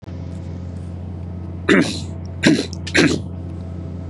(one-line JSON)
{"three_cough_length": "4.1 s", "three_cough_amplitude": 31716, "three_cough_signal_mean_std_ratio": 0.67, "survey_phase": "beta (2021-08-13 to 2022-03-07)", "age": "18-44", "gender": "Male", "wearing_mask": "No", "symptom_none": true, "smoker_status": "Ex-smoker", "respiratory_condition_asthma": false, "respiratory_condition_other": false, "recruitment_source": "REACT", "submission_delay": "3 days", "covid_test_result": "Negative", "covid_test_method": "RT-qPCR", "influenza_a_test_result": "Negative", "influenza_b_test_result": "Negative"}